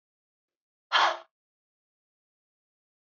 {"exhalation_length": "3.1 s", "exhalation_amplitude": 10430, "exhalation_signal_mean_std_ratio": 0.22, "survey_phase": "beta (2021-08-13 to 2022-03-07)", "age": "18-44", "gender": "Female", "wearing_mask": "No", "symptom_runny_or_blocked_nose": true, "smoker_status": "Never smoked", "respiratory_condition_asthma": true, "respiratory_condition_other": false, "recruitment_source": "REACT", "submission_delay": "2 days", "covid_test_result": "Negative", "covid_test_method": "RT-qPCR", "influenza_a_test_result": "Negative", "influenza_b_test_result": "Negative"}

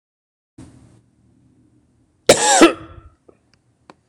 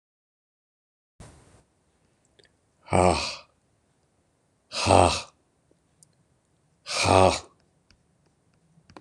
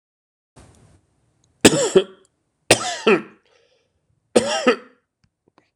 {"cough_length": "4.1 s", "cough_amplitude": 26028, "cough_signal_mean_std_ratio": 0.25, "exhalation_length": "9.0 s", "exhalation_amplitude": 24783, "exhalation_signal_mean_std_ratio": 0.27, "three_cough_length": "5.8 s", "three_cough_amplitude": 26028, "three_cough_signal_mean_std_ratio": 0.3, "survey_phase": "beta (2021-08-13 to 2022-03-07)", "age": "65+", "gender": "Male", "wearing_mask": "No", "symptom_none": true, "smoker_status": "Never smoked", "respiratory_condition_asthma": false, "respiratory_condition_other": true, "recruitment_source": "REACT", "submission_delay": "2 days", "covid_test_result": "Negative", "covid_test_method": "RT-qPCR", "influenza_a_test_result": "Unknown/Void", "influenza_b_test_result": "Unknown/Void"}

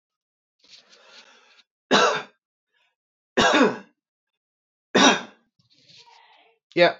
{"three_cough_length": "7.0 s", "three_cough_amplitude": 25126, "three_cough_signal_mean_std_ratio": 0.32, "survey_phase": "alpha (2021-03-01 to 2021-08-12)", "age": "18-44", "gender": "Male", "wearing_mask": "No", "symptom_none": true, "smoker_status": "Current smoker (e-cigarettes or vapes only)", "respiratory_condition_asthma": true, "respiratory_condition_other": false, "recruitment_source": "REACT", "submission_delay": "1 day", "covid_test_result": "Negative", "covid_test_method": "RT-qPCR"}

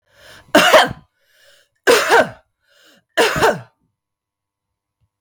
{"three_cough_length": "5.2 s", "three_cough_amplitude": 32768, "three_cough_signal_mean_std_ratio": 0.37, "survey_phase": "beta (2021-08-13 to 2022-03-07)", "age": "45-64", "gender": "Female", "wearing_mask": "No", "symptom_cough_any": true, "symptom_runny_or_blocked_nose": true, "symptom_fatigue": true, "symptom_fever_high_temperature": true, "symptom_headache": true, "symptom_onset": "2 days", "smoker_status": "Never smoked", "respiratory_condition_asthma": false, "respiratory_condition_other": false, "recruitment_source": "Test and Trace", "submission_delay": "1 day", "covid_test_result": "Positive", "covid_test_method": "RT-qPCR", "covid_ct_value": 18.9, "covid_ct_gene": "ORF1ab gene", "covid_ct_mean": 18.9, "covid_viral_load": "610000 copies/ml", "covid_viral_load_category": "Low viral load (10K-1M copies/ml)"}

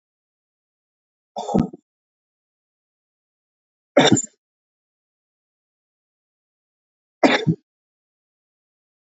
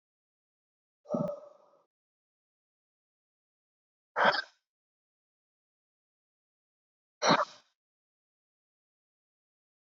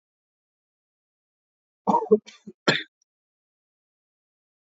{"three_cough_length": "9.1 s", "three_cough_amplitude": 31829, "three_cough_signal_mean_std_ratio": 0.2, "exhalation_length": "9.8 s", "exhalation_amplitude": 8861, "exhalation_signal_mean_std_ratio": 0.2, "cough_length": "4.8 s", "cough_amplitude": 20573, "cough_signal_mean_std_ratio": 0.2, "survey_phase": "beta (2021-08-13 to 2022-03-07)", "age": "45-64", "gender": "Male", "wearing_mask": "No", "symptom_none": true, "smoker_status": "Never smoked", "respiratory_condition_asthma": false, "respiratory_condition_other": false, "recruitment_source": "REACT", "submission_delay": "1 day", "covid_test_result": "Negative", "covid_test_method": "RT-qPCR"}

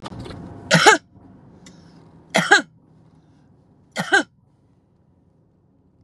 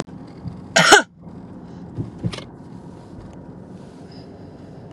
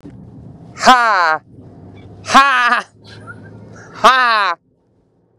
{"three_cough_length": "6.0 s", "three_cough_amplitude": 32768, "three_cough_signal_mean_std_ratio": 0.29, "cough_length": "4.9 s", "cough_amplitude": 32768, "cough_signal_mean_std_ratio": 0.34, "exhalation_length": "5.4 s", "exhalation_amplitude": 32768, "exhalation_signal_mean_std_ratio": 0.44, "survey_phase": "beta (2021-08-13 to 2022-03-07)", "age": "45-64", "gender": "Female", "wearing_mask": "No", "symptom_none": true, "symptom_onset": "6 days", "smoker_status": "Current smoker (1 to 10 cigarettes per day)", "respiratory_condition_asthma": false, "respiratory_condition_other": false, "recruitment_source": "REACT", "submission_delay": "1 day", "covid_test_result": "Negative", "covid_test_method": "RT-qPCR", "influenza_a_test_result": "Negative", "influenza_b_test_result": "Negative"}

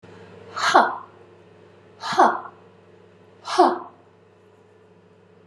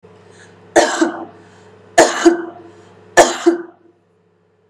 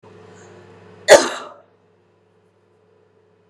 {"exhalation_length": "5.5 s", "exhalation_amplitude": 29558, "exhalation_signal_mean_std_ratio": 0.34, "three_cough_length": "4.7 s", "three_cough_amplitude": 32768, "three_cough_signal_mean_std_ratio": 0.38, "cough_length": "3.5 s", "cough_amplitude": 32768, "cough_signal_mean_std_ratio": 0.2, "survey_phase": "beta (2021-08-13 to 2022-03-07)", "age": "45-64", "gender": "Female", "wearing_mask": "No", "symptom_runny_or_blocked_nose": true, "symptom_fatigue": true, "smoker_status": "Ex-smoker", "respiratory_condition_asthma": false, "respiratory_condition_other": false, "recruitment_source": "REACT", "submission_delay": "2 days", "covid_test_result": "Negative", "covid_test_method": "RT-qPCR"}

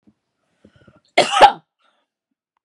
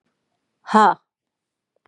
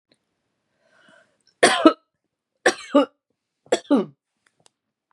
{"cough_length": "2.6 s", "cough_amplitude": 32768, "cough_signal_mean_std_ratio": 0.24, "exhalation_length": "1.9 s", "exhalation_amplitude": 31255, "exhalation_signal_mean_std_ratio": 0.27, "three_cough_length": "5.1 s", "three_cough_amplitude": 30835, "three_cough_signal_mean_std_ratio": 0.27, "survey_phase": "beta (2021-08-13 to 2022-03-07)", "age": "45-64", "gender": "Female", "wearing_mask": "No", "symptom_none": true, "smoker_status": "Never smoked", "respiratory_condition_asthma": false, "respiratory_condition_other": false, "recruitment_source": "REACT", "submission_delay": "11 days", "covid_test_result": "Negative", "covid_test_method": "RT-qPCR"}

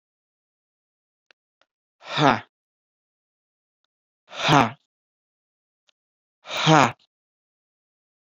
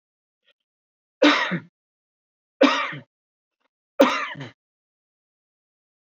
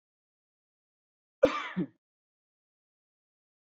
{"exhalation_length": "8.3 s", "exhalation_amplitude": 26875, "exhalation_signal_mean_std_ratio": 0.23, "three_cough_length": "6.1 s", "three_cough_amplitude": 24310, "three_cough_signal_mean_std_ratio": 0.28, "cough_length": "3.7 s", "cough_amplitude": 10916, "cough_signal_mean_std_ratio": 0.18, "survey_phase": "alpha (2021-03-01 to 2021-08-12)", "age": "18-44", "gender": "Male", "wearing_mask": "Yes", "symptom_none": true, "smoker_status": "Never smoked", "respiratory_condition_asthma": true, "respiratory_condition_other": false, "recruitment_source": "Test and Trace", "submission_delay": "0 days", "covid_test_result": "Negative", "covid_test_method": "LFT"}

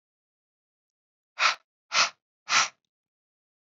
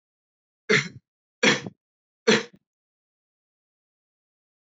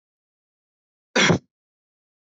{"exhalation_length": "3.7 s", "exhalation_amplitude": 15387, "exhalation_signal_mean_std_ratio": 0.28, "three_cough_length": "4.6 s", "three_cough_amplitude": 16638, "three_cough_signal_mean_std_ratio": 0.25, "cough_length": "2.3 s", "cough_amplitude": 16621, "cough_signal_mean_std_ratio": 0.24, "survey_phase": "beta (2021-08-13 to 2022-03-07)", "age": "18-44", "gender": "Male", "wearing_mask": "No", "symptom_none": true, "smoker_status": "Never smoked", "respiratory_condition_asthma": false, "respiratory_condition_other": false, "recruitment_source": "REACT", "submission_delay": "6 days", "covid_test_result": "Negative", "covid_test_method": "RT-qPCR", "influenza_a_test_result": "Unknown/Void", "influenza_b_test_result": "Unknown/Void"}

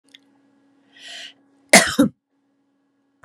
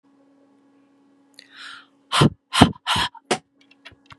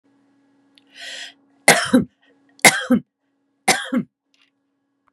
{"cough_length": "3.2 s", "cough_amplitude": 32768, "cough_signal_mean_std_ratio": 0.23, "exhalation_length": "4.2 s", "exhalation_amplitude": 32768, "exhalation_signal_mean_std_ratio": 0.29, "three_cough_length": "5.1 s", "three_cough_amplitude": 32768, "three_cough_signal_mean_std_ratio": 0.3, "survey_phase": "beta (2021-08-13 to 2022-03-07)", "age": "65+", "gender": "Female", "wearing_mask": "No", "symptom_none": true, "smoker_status": "Ex-smoker", "respiratory_condition_asthma": false, "respiratory_condition_other": false, "recruitment_source": "REACT", "submission_delay": "8 days", "covid_test_result": "Negative", "covid_test_method": "RT-qPCR", "influenza_a_test_result": "Negative", "influenza_b_test_result": "Negative"}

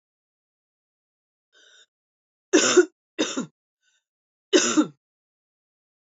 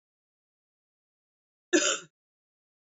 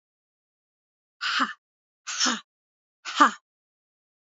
{"three_cough_length": "6.1 s", "three_cough_amplitude": 19243, "three_cough_signal_mean_std_ratio": 0.27, "cough_length": "3.0 s", "cough_amplitude": 9779, "cough_signal_mean_std_ratio": 0.22, "exhalation_length": "4.4 s", "exhalation_amplitude": 22450, "exhalation_signal_mean_std_ratio": 0.28, "survey_phase": "beta (2021-08-13 to 2022-03-07)", "age": "45-64", "gender": "Female", "wearing_mask": "No", "symptom_cough_any": true, "symptom_runny_or_blocked_nose": true, "symptom_shortness_of_breath": true, "symptom_fatigue": true, "symptom_fever_high_temperature": true, "symptom_headache": true, "symptom_onset": "2 days", "smoker_status": "Never smoked", "respiratory_condition_asthma": false, "respiratory_condition_other": false, "recruitment_source": "Test and Trace", "submission_delay": "2 days", "covid_test_result": "Positive", "covid_test_method": "RT-qPCR", "covid_ct_value": 18.0, "covid_ct_gene": "ORF1ab gene", "covid_ct_mean": 18.2, "covid_viral_load": "1000000 copies/ml", "covid_viral_load_category": "High viral load (>1M copies/ml)"}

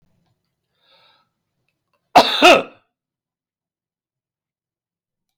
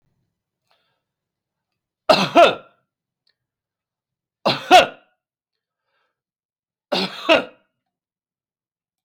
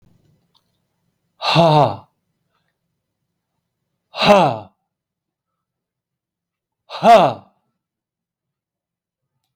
{"cough_length": "5.4 s", "cough_amplitude": 32279, "cough_signal_mean_std_ratio": 0.21, "three_cough_length": "9.0 s", "three_cough_amplitude": 31509, "three_cough_signal_mean_std_ratio": 0.24, "exhalation_length": "9.6 s", "exhalation_amplitude": 31237, "exhalation_signal_mean_std_ratio": 0.28, "survey_phase": "alpha (2021-03-01 to 2021-08-12)", "age": "65+", "gender": "Male", "wearing_mask": "No", "symptom_none": true, "smoker_status": "Never smoked", "respiratory_condition_asthma": false, "respiratory_condition_other": false, "recruitment_source": "REACT", "submission_delay": "1 day", "covid_test_result": "Negative", "covid_test_method": "RT-qPCR"}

